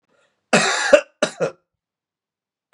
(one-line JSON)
{"cough_length": "2.7 s", "cough_amplitude": 32768, "cough_signal_mean_std_ratio": 0.33, "survey_phase": "beta (2021-08-13 to 2022-03-07)", "age": "18-44", "gender": "Male", "wearing_mask": "No", "symptom_cough_any": true, "symptom_runny_or_blocked_nose": true, "symptom_sore_throat": true, "symptom_fatigue": true, "symptom_onset": "5 days", "smoker_status": "Never smoked", "respiratory_condition_asthma": false, "respiratory_condition_other": false, "recruitment_source": "Test and Trace", "submission_delay": "2 days", "covid_test_result": "Positive", "covid_test_method": "RT-qPCR"}